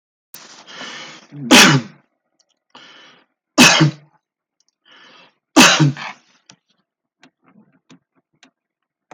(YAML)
three_cough_length: 9.1 s
three_cough_amplitude: 32768
three_cough_signal_mean_std_ratio: 0.29
survey_phase: beta (2021-08-13 to 2022-03-07)
age: 65+
gender: Male
wearing_mask: 'No'
symptom_none: true
smoker_status: Never smoked
respiratory_condition_asthma: false
respiratory_condition_other: false
recruitment_source: REACT
submission_delay: 11 days
covid_test_result: Negative
covid_test_method: RT-qPCR